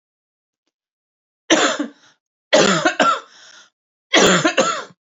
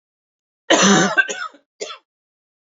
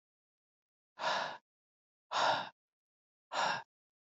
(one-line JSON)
{"three_cough_length": "5.1 s", "three_cough_amplitude": 30345, "three_cough_signal_mean_std_ratio": 0.44, "cough_length": "2.6 s", "cough_amplitude": 29963, "cough_signal_mean_std_ratio": 0.4, "exhalation_length": "4.1 s", "exhalation_amplitude": 3488, "exhalation_signal_mean_std_ratio": 0.39, "survey_phase": "beta (2021-08-13 to 2022-03-07)", "age": "45-64", "gender": "Female", "wearing_mask": "No", "symptom_cough_any": true, "symptom_onset": "4 days", "smoker_status": "Ex-smoker", "respiratory_condition_asthma": true, "respiratory_condition_other": false, "recruitment_source": "Test and Trace", "submission_delay": "1 day", "covid_test_result": "Negative", "covid_test_method": "RT-qPCR"}